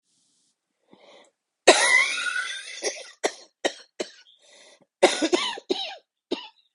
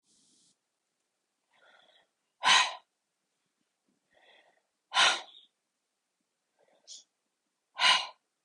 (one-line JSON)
{"cough_length": "6.7 s", "cough_amplitude": 31374, "cough_signal_mean_std_ratio": 0.37, "exhalation_length": "8.4 s", "exhalation_amplitude": 11848, "exhalation_signal_mean_std_ratio": 0.24, "survey_phase": "beta (2021-08-13 to 2022-03-07)", "age": "45-64", "gender": "Female", "wearing_mask": "No", "symptom_cough_any": true, "symptom_onset": "6 days", "smoker_status": "Current smoker (e-cigarettes or vapes only)", "respiratory_condition_asthma": false, "respiratory_condition_other": false, "recruitment_source": "Test and Trace", "submission_delay": "1 day", "covid_test_result": "Negative", "covid_test_method": "RT-qPCR"}